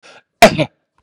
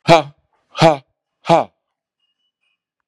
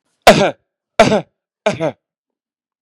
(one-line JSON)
{"cough_length": "1.0 s", "cough_amplitude": 32768, "cough_signal_mean_std_ratio": 0.31, "exhalation_length": "3.1 s", "exhalation_amplitude": 32768, "exhalation_signal_mean_std_ratio": 0.28, "three_cough_length": "2.8 s", "three_cough_amplitude": 32768, "three_cough_signal_mean_std_ratio": 0.33, "survey_phase": "beta (2021-08-13 to 2022-03-07)", "age": "65+", "gender": "Male", "wearing_mask": "No", "symptom_diarrhoea": true, "smoker_status": "Never smoked", "respiratory_condition_asthma": false, "respiratory_condition_other": false, "recruitment_source": "REACT", "submission_delay": "3 days", "covid_test_result": "Negative", "covid_test_method": "RT-qPCR", "influenza_a_test_result": "Negative", "influenza_b_test_result": "Negative"}